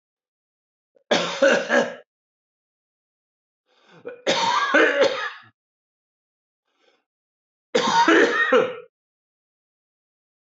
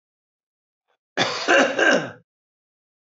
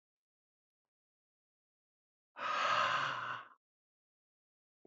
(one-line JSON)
{"three_cough_length": "10.5 s", "three_cough_amplitude": 21532, "three_cough_signal_mean_std_ratio": 0.41, "cough_length": "3.1 s", "cough_amplitude": 21929, "cough_signal_mean_std_ratio": 0.4, "exhalation_length": "4.9 s", "exhalation_amplitude": 2671, "exhalation_signal_mean_std_ratio": 0.37, "survey_phase": "beta (2021-08-13 to 2022-03-07)", "age": "45-64", "gender": "Male", "wearing_mask": "No", "symptom_cough_any": true, "symptom_runny_or_blocked_nose": true, "symptom_sore_throat": true, "symptom_fatigue": true, "symptom_headache": true, "symptom_onset": "12 days", "smoker_status": "Ex-smoker", "respiratory_condition_asthma": false, "respiratory_condition_other": false, "recruitment_source": "REACT", "submission_delay": "2 days", "covid_test_result": "Negative", "covid_test_method": "RT-qPCR", "influenza_a_test_result": "Negative", "influenza_b_test_result": "Negative"}